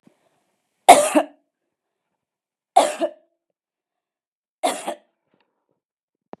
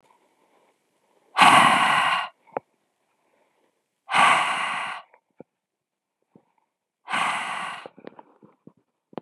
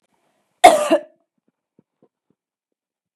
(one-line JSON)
{"three_cough_length": "6.4 s", "three_cough_amplitude": 32768, "three_cough_signal_mean_std_ratio": 0.22, "exhalation_length": "9.2 s", "exhalation_amplitude": 27423, "exhalation_signal_mean_std_ratio": 0.37, "cough_length": "3.2 s", "cough_amplitude": 32768, "cough_signal_mean_std_ratio": 0.22, "survey_phase": "beta (2021-08-13 to 2022-03-07)", "age": "18-44", "gender": "Female", "wearing_mask": "No", "symptom_cough_any": true, "smoker_status": "Current smoker (11 or more cigarettes per day)", "respiratory_condition_asthma": false, "respiratory_condition_other": false, "recruitment_source": "REACT", "submission_delay": "0 days", "covid_test_result": "Negative", "covid_test_method": "RT-qPCR", "influenza_a_test_result": "Negative", "influenza_b_test_result": "Negative"}